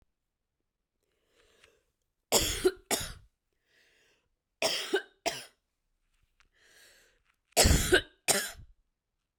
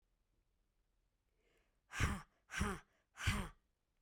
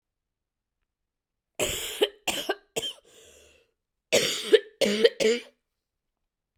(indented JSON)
{
  "three_cough_length": "9.4 s",
  "three_cough_amplitude": 11987,
  "three_cough_signal_mean_std_ratio": 0.3,
  "exhalation_length": "4.0 s",
  "exhalation_amplitude": 2389,
  "exhalation_signal_mean_std_ratio": 0.35,
  "cough_length": "6.6 s",
  "cough_amplitude": 20033,
  "cough_signal_mean_std_ratio": 0.35,
  "survey_phase": "beta (2021-08-13 to 2022-03-07)",
  "age": "18-44",
  "gender": "Female",
  "wearing_mask": "No",
  "symptom_cough_any": true,
  "symptom_new_continuous_cough": true,
  "symptom_runny_or_blocked_nose": true,
  "symptom_shortness_of_breath": true,
  "symptom_sore_throat": true,
  "symptom_fatigue": true,
  "symptom_headache": true,
  "symptom_change_to_sense_of_smell_or_taste": true,
  "symptom_onset": "2 days",
  "smoker_status": "Never smoked",
  "respiratory_condition_asthma": false,
  "respiratory_condition_other": false,
  "recruitment_source": "Test and Trace",
  "submission_delay": "1 day",
  "covid_test_result": "Positive",
  "covid_test_method": "RT-qPCR",
  "covid_ct_value": 30.5,
  "covid_ct_gene": "ORF1ab gene",
  "covid_ct_mean": 31.4,
  "covid_viral_load": "50 copies/ml",
  "covid_viral_load_category": "Minimal viral load (< 10K copies/ml)"
}